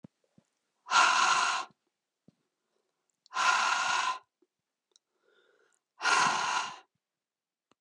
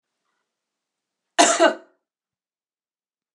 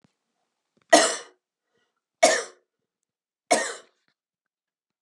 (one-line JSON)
{"exhalation_length": "7.8 s", "exhalation_amplitude": 9814, "exhalation_signal_mean_std_ratio": 0.44, "cough_length": "3.3 s", "cough_amplitude": 26657, "cough_signal_mean_std_ratio": 0.24, "three_cough_length": "5.0 s", "three_cough_amplitude": 28780, "three_cough_signal_mean_std_ratio": 0.25, "survey_phase": "beta (2021-08-13 to 2022-03-07)", "age": "18-44", "gender": "Female", "wearing_mask": "No", "symptom_none": true, "smoker_status": "Never smoked", "respiratory_condition_asthma": false, "respiratory_condition_other": false, "recruitment_source": "REACT", "submission_delay": "1 day", "covid_test_result": "Negative", "covid_test_method": "RT-qPCR", "influenza_a_test_result": "Negative", "influenza_b_test_result": "Negative"}